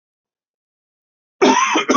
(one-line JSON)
{"cough_length": "2.0 s", "cough_amplitude": 27920, "cough_signal_mean_std_ratio": 0.41, "survey_phase": "beta (2021-08-13 to 2022-03-07)", "age": "18-44", "gender": "Male", "wearing_mask": "No", "symptom_cough_any": true, "symptom_runny_or_blocked_nose": true, "symptom_fever_high_temperature": true, "symptom_change_to_sense_of_smell_or_taste": true, "symptom_loss_of_taste": true, "symptom_onset": "4 days", "smoker_status": "Never smoked", "respiratory_condition_asthma": false, "respiratory_condition_other": false, "recruitment_source": "Test and Trace", "submission_delay": "2 days", "covid_test_result": "Positive", "covid_test_method": "RT-qPCR"}